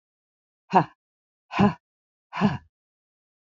exhalation_length: 3.4 s
exhalation_amplitude: 22303
exhalation_signal_mean_std_ratio: 0.27
survey_phase: beta (2021-08-13 to 2022-03-07)
age: 65+
gender: Female
wearing_mask: 'No'
symptom_cough_any: true
symptom_sore_throat: true
symptom_fever_high_temperature: true
symptom_headache: true
symptom_onset: 5 days
smoker_status: Never smoked
respiratory_condition_asthma: false
respiratory_condition_other: false
recruitment_source: Test and Trace
submission_delay: 2 days
covid_test_result: Positive
covid_test_method: RT-qPCR
covid_ct_value: 30.7
covid_ct_gene: ORF1ab gene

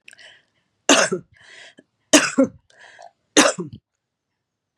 three_cough_length: 4.8 s
three_cough_amplitude: 32767
three_cough_signal_mean_std_ratio: 0.3
survey_phase: beta (2021-08-13 to 2022-03-07)
age: 65+
gender: Female
wearing_mask: 'No'
symptom_cough_any: true
symptom_runny_or_blocked_nose: true
symptom_sore_throat: true
symptom_fatigue: true
smoker_status: Ex-smoker
respiratory_condition_asthma: false
respiratory_condition_other: false
recruitment_source: REACT
submission_delay: 2 days
covid_test_result: Positive
covid_test_method: RT-qPCR
covid_ct_value: 22.0
covid_ct_gene: E gene
influenza_a_test_result: Negative
influenza_b_test_result: Negative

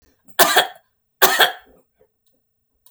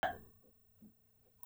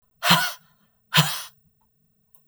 three_cough_length: 2.9 s
three_cough_amplitude: 32768
three_cough_signal_mean_std_ratio: 0.33
cough_length: 1.5 s
cough_amplitude: 2202
cough_signal_mean_std_ratio: 0.33
exhalation_length: 2.5 s
exhalation_amplitude: 32768
exhalation_signal_mean_std_ratio: 0.35
survey_phase: beta (2021-08-13 to 2022-03-07)
age: 45-64
gender: Female
wearing_mask: 'No'
symptom_none: true
smoker_status: Never smoked
respiratory_condition_asthma: false
respiratory_condition_other: false
recruitment_source: REACT
submission_delay: 1 day
covid_test_result: Negative
covid_test_method: RT-qPCR
influenza_a_test_result: Negative
influenza_b_test_result: Negative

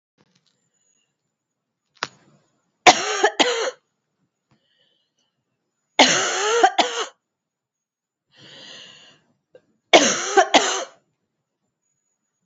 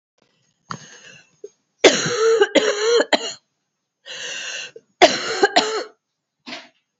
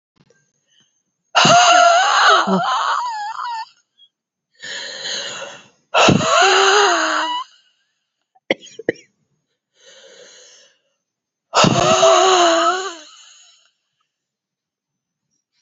three_cough_length: 12.5 s
three_cough_amplitude: 32768
three_cough_signal_mean_std_ratio: 0.31
cough_length: 7.0 s
cough_amplitude: 31247
cough_signal_mean_std_ratio: 0.42
exhalation_length: 15.6 s
exhalation_amplitude: 32186
exhalation_signal_mean_std_ratio: 0.49
survey_phase: beta (2021-08-13 to 2022-03-07)
age: 45-64
gender: Female
wearing_mask: 'No'
symptom_cough_any: true
symptom_runny_or_blocked_nose: true
symptom_abdominal_pain: true
symptom_fatigue: true
symptom_headache: true
symptom_onset: 2 days
smoker_status: Ex-smoker
respiratory_condition_asthma: false
respiratory_condition_other: false
recruitment_source: Test and Trace
submission_delay: 2 days
covid_test_result: Positive
covid_test_method: ePCR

